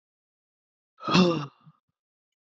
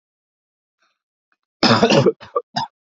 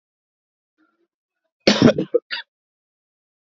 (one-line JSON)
{"exhalation_length": "2.6 s", "exhalation_amplitude": 15980, "exhalation_signal_mean_std_ratio": 0.29, "three_cough_length": "3.0 s", "three_cough_amplitude": 30281, "three_cough_signal_mean_std_ratio": 0.35, "cough_length": "3.5 s", "cough_amplitude": 32767, "cough_signal_mean_std_ratio": 0.24, "survey_phase": "alpha (2021-03-01 to 2021-08-12)", "age": "18-44", "gender": "Male", "wearing_mask": "No", "symptom_cough_any": true, "symptom_abdominal_pain": true, "symptom_fatigue": true, "symptom_fever_high_temperature": true, "symptom_headache": true, "smoker_status": "Never smoked", "respiratory_condition_asthma": false, "respiratory_condition_other": false, "recruitment_source": "Test and Trace", "submission_delay": "2 days", "covid_test_result": "Positive", "covid_test_method": "RT-qPCR", "covid_ct_value": 12.5, "covid_ct_gene": "ORF1ab gene", "covid_ct_mean": 13.6, "covid_viral_load": "36000000 copies/ml", "covid_viral_load_category": "High viral load (>1M copies/ml)"}